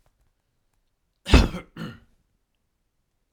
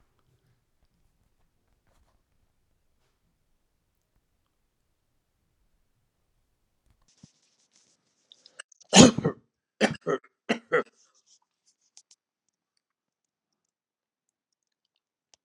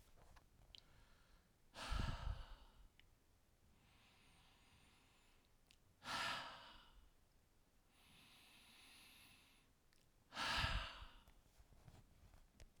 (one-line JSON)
{"cough_length": "3.3 s", "cough_amplitude": 30402, "cough_signal_mean_std_ratio": 0.2, "three_cough_length": "15.4 s", "three_cough_amplitude": 32317, "three_cough_signal_mean_std_ratio": 0.14, "exhalation_length": "12.8 s", "exhalation_amplitude": 1441, "exhalation_signal_mean_std_ratio": 0.41, "survey_phase": "alpha (2021-03-01 to 2021-08-12)", "age": "65+", "gender": "Male", "wearing_mask": "No", "symptom_none": true, "smoker_status": "Never smoked", "respiratory_condition_asthma": false, "respiratory_condition_other": false, "recruitment_source": "REACT", "submission_delay": "1 day", "covid_test_result": "Negative", "covid_test_method": "RT-qPCR"}